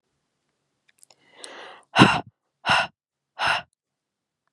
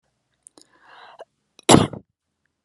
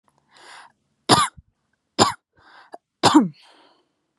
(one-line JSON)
{"exhalation_length": "4.5 s", "exhalation_amplitude": 32768, "exhalation_signal_mean_std_ratio": 0.28, "cough_length": "2.6 s", "cough_amplitude": 32768, "cough_signal_mean_std_ratio": 0.2, "three_cough_length": "4.2 s", "three_cough_amplitude": 32581, "three_cough_signal_mean_std_ratio": 0.29, "survey_phase": "beta (2021-08-13 to 2022-03-07)", "age": "18-44", "gender": "Female", "wearing_mask": "No", "symptom_none": true, "smoker_status": "Never smoked", "respiratory_condition_asthma": false, "respiratory_condition_other": false, "recruitment_source": "REACT", "submission_delay": "2 days", "covid_test_result": "Negative", "covid_test_method": "RT-qPCR", "influenza_a_test_result": "Unknown/Void", "influenza_b_test_result": "Unknown/Void"}